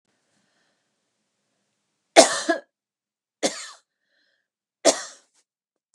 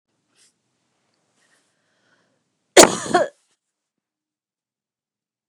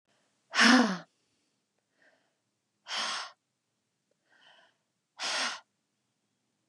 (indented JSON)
{
  "three_cough_length": "5.9 s",
  "three_cough_amplitude": 32768,
  "three_cough_signal_mean_std_ratio": 0.2,
  "cough_length": "5.5 s",
  "cough_amplitude": 32768,
  "cough_signal_mean_std_ratio": 0.17,
  "exhalation_length": "6.7 s",
  "exhalation_amplitude": 13520,
  "exhalation_signal_mean_std_ratio": 0.27,
  "survey_phase": "beta (2021-08-13 to 2022-03-07)",
  "age": "45-64",
  "gender": "Female",
  "wearing_mask": "No",
  "symptom_none": true,
  "smoker_status": "Never smoked",
  "respiratory_condition_asthma": false,
  "respiratory_condition_other": false,
  "recruitment_source": "REACT",
  "submission_delay": "2 days",
  "covid_test_result": "Negative",
  "covid_test_method": "RT-qPCR",
  "influenza_a_test_result": "Negative",
  "influenza_b_test_result": "Negative"
}